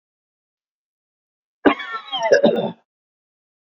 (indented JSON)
{
  "cough_length": "3.7 s",
  "cough_amplitude": 27166,
  "cough_signal_mean_std_ratio": 0.33,
  "survey_phase": "beta (2021-08-13 to 2022-03-07)",
  "age": "65+",
  "gender": "Male",
  "wearing_mask": "No",
  "symptom_none": true,
  "symptom_onset": "12 days",
  "smoker_status": "Ex-smoker",
  "respiratory_condition_asthma": false,
  "respiratory_condition_other": false,
  "recruitment_source": "REACT",
  "submission_delay": "2 days",
  "covid_test_result": "Negative",
  "covid_test_method": "RT-qPCR",
  "influenza_a_test_result": "Negative",
  "influenza_b_test_result": "Negative"
}